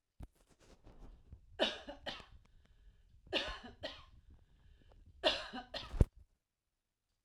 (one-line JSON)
{"three_cough_length": "7.2 s", "three_cough_amplitude": 8229, "three_cough_signal_mean_std_ratio": 0.3, "survey_phase": "alpha (2021-03-01 to 2021-08-12)", "age": "45-64", "gender": "Female", "wearing_mask": "No", "symptom_none": true, "smoker_status": "Ex-smoker", "respiratory_condition_asthma": false, "respiratory_condition_other": false, "recruitment_source": "REACT", "submission_delay": "6 days", "covid_test_result": "Negative", "covid_test_method": "RT-qPCR"}